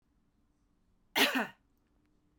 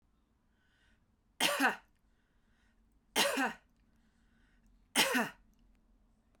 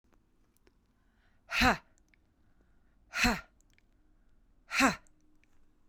cough_length: 2.4 s
cough_amplitude: 7583
cough_signal_mean_std_ratio: 0.28
three_cough_length: 6.4 s
three_cough_amplitude: 6387
three_cough_signal_mean_std_ratio: 0.33
exhalation_length: 5.9 s
exhalation_amplitude: 8007
exhalation_signal_mean_std_ratio: 0.28
survey_phase: beta (2021-08-13 to 2022-03-07)
age: 45-64
gender: Female
wearing_mask: 'No'
symptom_runny_or_blocked_nose: true
symptom_sore_throat: true
symptom_headache: true
smoker_status: Ex-smoker
respiratory_condition_asthma: true
respiratory_condition_other: false
recruitment_source: Test and Trace
submission_delay: 1 day
covid_test_result: Positive
covid_test_method: RT-qPCR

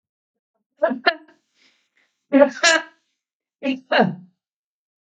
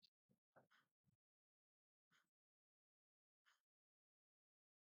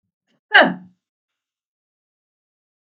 three_cough_length: 5.1 s
three_cough_amplitude: 32766
three_cough_signal_mean_std_ratio: 0.32
exhalation_length: 4.9 s
exhalation_amplitude: 48
exhalation_signal_mean_std_ratio: 0.25
cough_length: 2.8 s
cough_amplitude: 32768
cough_signal_mean_std_ratio: 0.19
survey_phase: beta (2021-08-13 to 2022-03-07)
age: 65+
gender: Female
wearing_mask: 'No'
symptom_none: true
smoker_status: Ex-smoker
respiratory_condition_asthma: false
respiratory_condition_other: false
recruitment_source: REACT
submission_delay: 1 day
covid_test_result: Negative
covid_test_method: RT-qPCR
influenza_a_test_result: Negative
influenza_b_test_result: Negative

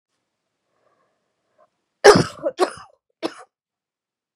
cough_length: 4.4 s
cough_amplitude: 32768
cough_signal_mean_std_ratio: 0.21
survey_phase: beta (2021-08-13 to 2022-03-07)
age: 45-64
gender: Female
wearing_mask: 'No'
symptom_cough_any: true
symptom_new_continuous_cough: true
symptom_runny_or_blocked_nose: true
symptom_fatigue: true
symptom_headache: true
symptom_change_to_sense_of_smell_or_taste: true
symptom_loss_of_taste: true
symptom_other: true
smoker_status: Never smoked
respiratory_condition_asthma: true
respiratory_condition_other: false
recruitment_source: Test and Trace
submission_delay: 2 days
covid_test_result: Positive
covid_test_method: LFT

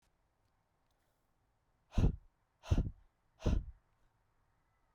exhalation_length: 4.9 s
exhalation_amplitude: 3866
exhalation_signal_mean_std_ratio: 0.27
survey_phase: beta (2021-08-13 to 2022-03-07)
age: 18-44
gender: Male
wearing_mask: 'No'
symptom_cough_any: true
symptom_runny_or_blocked_nose: true
symptom_sore_throat: true
symptom_onset: 8 days
smoker_status: Prefer not to say
respiratory_condition_asthma: false
respiratory_condition_other: false
recruitment_source: Test and Trace
submission_delay: 2 days
covid_test_result: Positive
covid_test_method: RT-qPCR
covid_ct_value: 11.4
covid_ct_gene: ORF1ab gene
covid_ct_mean: 11.8
covid_viral_load: 130000000 copies/ml
covid_viral_load_category: High viral load (>1M copies/ml)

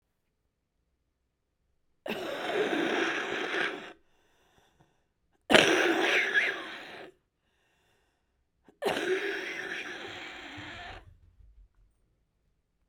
exhalation_length: 12.9 s
exhalation_amplitude: 29006
exhalation_signal_mean_std_ratio: 0.44
survey_phase: beta (2021-08-13 to 2022-03-07)
age: 45-64
gender: Female
wearing_mask: 'Yes'
symptom_cough_any: true
symptom_runny_or_blocked_nose: true
symptom_shortness_of_breath: true
symptom_sore_throat: true
symptom_diarrhoea: true
symptom_fatigue: true
symptom_fever_high_temperature: true
symptom_headache: true
symptom_change_to_sense_of_smell_or_taste: true
symptom_loss_of_taste: true
symptom_other: true
symptom_onset: 4 days
smoker_status: Current smoker (11 or more cigarettes per day)
respiratory_condition_asthma: false
respiratory_condition_other: false
recruitment_source: Test and Trace
submission_delay: 2 days
covid_test_result: Positive
covid_test_method: RT-qPCR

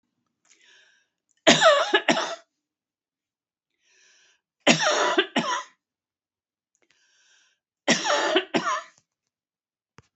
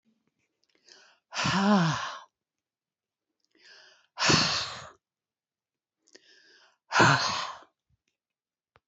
three_cough_length: 10.2 s
three_cough_amplitude: 26812
three_cough_signal_mean_std_ratio: 0.35
exhalation_length: 8.9 s
exhalation_amplitude: 12698
exhalation_signal_mean_std_ratio: 0.36
survey_phase: alpha (2021-03-01 to 2021-08-12)
age: 65+
gender: Female
wearing_mask: 'No'
symptom_none: true
smoker_status: Never smoked
respiratory_condition_asthma: false
respiratory_condition_other: false
recruitment_source: REACT
submission_delay: 2 days
covid_test_result: Negative
covid_test_method: RT-qPCR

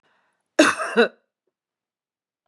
cough_length: 2.5 s
cough_amplitude: 29028
cough_signal_mean_std_ratio: 0.28
survey_phase: beta (2021-08-13 to 2022-03-07)
age: 45-64
gender: Female
wearing_mask: 'No'
symptom_none: true
symptom_onset: 3 days
smoker_status: Ex-smoker
respiratory_condition_asthma: false
respiratory_condition_other: false
recruitment_source: REACT
submission_delay: 2 days
covid_test_result: Negative
covid_test_method: RT-qPCR
influenza_a_test_result: Negative
influenza_b_test_result: Negative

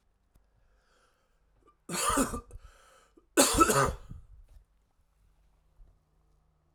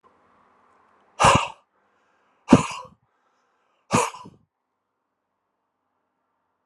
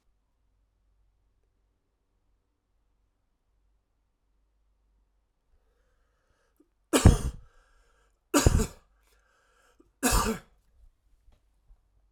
cough_length: 6.7 s
cough_amplitude: 16336
cough_signal_mean_std_ratio: 0.31
exhalation_length: 6.7 s
exhalation_amplitude: 32768
exhalation_signal_mean_std_ratio: 0.22
three_cough_length: 12.1 s
three_cough_amplitude: 21268
three_cough_signal_mean_std_ratio: 0.2
survey_phase: alpha (2021-03-01 to 2021-08-12)
age: 45-64
gender: Male
wearing_mask: 'No'
symptom_cough_any: true
symptom_shortness_of_breath: true
symptom_fatigue: true
symptom_headache: true
symptom_change_to_sense_of_smell_or_taste: true
symptom_onset: 4 days
smoker_status: Never smoked
respiratory_condition_asthma: false
respiratory_condition_other: false
recruitment_source: Test and Trace
submission_delay: 2 days
covid_test_result: Positive
covid_test_method: RT-qPCR
covid_ct_value: 19.1
covid_ct_gene: ORF1ab gene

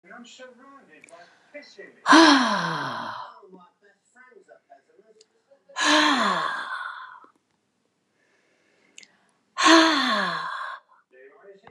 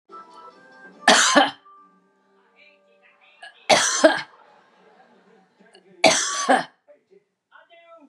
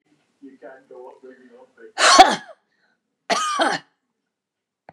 exhalation_length: 11.7 s
exhalation_amplitude: 28832
exhalation_signal_mean_std_ratio: 0.38
three_cough_length: 8.1 s
three_cough_amplitude: 32219
three_cough_signal_mean_std_ratio: 0.33
cough_length: 4.9 s
cough_amplitude: 32768
cough_signal_mean_std_ratio: 0.3
survey_phase: beta (2021-08-13 to 2022-03-07)
age: 65+
gender: Female
wearing_mask: 'No'
symptom_none: true
smoker_status: Ex-smoker
respiratory_condition_asthma: true
respiratory_condition_other: false
recruitment_source: REACT
submission_delay: 4 days
covid_test_result: Negative
covid_test_method: RT-qPCR
influenza_a_test_result: Negative
influenza_b_test_result: Negative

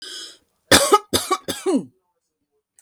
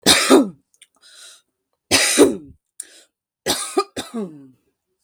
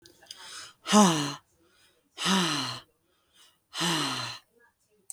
cough_length: 2.8 s
cough_amplitude: 32768
cough_signal_mean_std_ratio: 0.38
three_cough_length: 5.0 s
three_cough_amplitude: 32768
three_cough_signal_mean_std_ratio: 0.39
exhalation_length: 5.1 s
exhalation_amplitude: 15653
exhalation_signal_mean_std_ratio: 0.42
survey_phase: beta (2021-08-13 to 2022-03-07)
age: 45-64
gender: Female
wearing_mask: 'No'
symptom_none: true
smoker_status: Never smoked
respiratory_condition_asthma: false
respiratory_condition_other: false
recruitment_source: REACT
submission_delay: 3 days
covid_test_result: Negative
covid_test_method: RT-qPCR
influenza_a_test_result: Negative
influenza_b_test_result: Negative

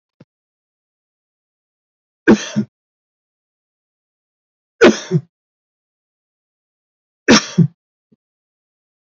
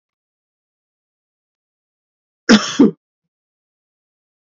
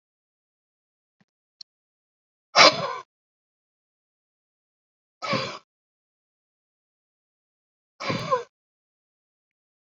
three_cough_length: 9.1 s
three_cough_amplitude: 32675
three_cough_signal_mean_std_ratio: 0.21
cough_length: 4.5 s
cough_amplitude: 32768
cough_signal_mean_std_ratio: 0.2
exhalation_length: 10.0 s
exhalation_amplitude: 29541
exhalation_signal_mean_std_ratio: 0.19
survey_phase: beta (2021-08-13 to 2022-03-07)
age: 65+
gender: Male
wearing_mask: 'No'
symptom_none: true
smoker_status: Never smoked
respiratory_condition_asthma: false
respiratory_condition_other: false
recruitment_source: REACT
submission_delay: 1 day
covid_test_result: Negative
covid_test_method: RT-qPCR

